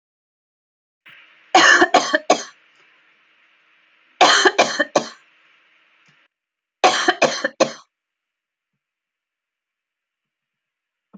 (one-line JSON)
{"three_cough_length": "11.2 s", "three_cough_amplitude": 30636, "three_cough_signal_mean_std_ratio": 0.3, "survey_phase": "alpha (2021-03-01 to 2021-08-12)", "age": "45-64", "gender": "Female", "wearing_mask": "No", "symptom_none": true, "smoker_status": "Never smoked", "respiratory_condition_asthma": false, "respiratory_condition_other": false, "recruitment_source": "REACT", "submission_delay": "1 day", "covid_test_result": "Negative", "covid_test_method": "RT-qPCR"}